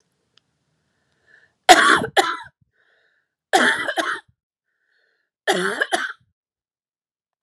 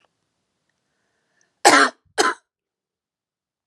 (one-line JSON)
{"three_cough_length": "7.4 s", "three_cough_amplitude": 32768, "three_cough_signal_mean_std_ratio": 0.32, "cough_length": "3.7 s", "cough_amplitude": 32767, "cough_signal_mean_std_ratio": 0.24, "survey_phase": "beta (2021-08-13 to 2022-03-07)", "age": "18-44", "gender": "Female", "wearing_mask": "No", "symptom_none": true, "smoker_status": "Ex-smoker", "respiratory_condition_asthma": false, "respiratory_condition_other": false, "recruitment_source": "REACT", "submission_delay": "2 days", "covid_test_result": "Negative", "covid_test_method": "RT-qPCR"}